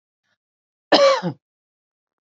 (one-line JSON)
{"cough_length": "2.2 s", "cough_amplitude": 27760, "cough_signal_mean_std_ratio": 0.31, "survey_phase": "alpha (2021-03-01 to 2021-08-12)", "age": "45-64", "gender": "Female", "wearing_mask": "No", "symptom_none": true, "smoker_status": "Never smoked", "respiratory_condition_asthma": false, "respiratory_condition_other": false, "recruitment_source": "REACT", "submission_delay": "2 days", "covid_test_result": "Negative", "covid_test_method": "RT-qPCR"}